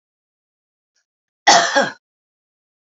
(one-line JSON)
{"three_cough_length": "2.8 s", "three_cough_amplitude": 28823, "three_cough_signal_mean_std_ratio": 0.28, "survey_phase": "beta (2021-08-13 to 2022-03-07)", "age": "45-64", "gender": "Female", "wearing_mask": "No", "symptom_cough_any": true, "symptom_new_continuous_cough": true, "symptom_fatigue": true, "symptom_headache": true, "symptom_change_to_sense_of_smell_or_taste": true, "smoker_status": "Ex-smoker", "respiratory_condition_asthma": false, "respiratory_condition_other": false, "recruitment_source": "Test and Trace", "submission_delay": "-1 day", "covid_test_result": "Positive", "covid_test_method": "LFT"}